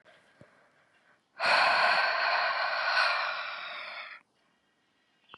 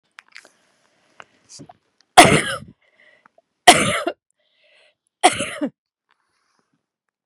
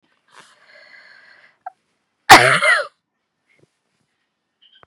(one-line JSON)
{"exhalation_length": "5.4 s", "exhalation_amplitude": 8522, "exhalation_signal_mean_std_ratio": 0.59, "three_cough_length": "7.3 s", "three_cough_amplitude": 32768, "three_cough_signal_mean_std_ratio": 0.24, "cough_length": "4.9 s", "cough_amplitude": 32768, "cough_signal_mean_std_ratio": 0.24, "survey_phase": "beta (2021-08-13 to 2022-03-07)", "age": "18-44", "gender": "Female", "wearing_mask": "No", "symptom_none": true, "smoker_status": "Never smoked", "respiratory_condition_asthma": false, "respiratory_condition_other": false, "recruitment_source": "REACT", "submission_delay": "1 day", "covid_test_result": "Negative", "covid_test_method": "RT-qPCR", "influenza_a_test_result": "Negative", "influenza_b_test_result": "Negative"}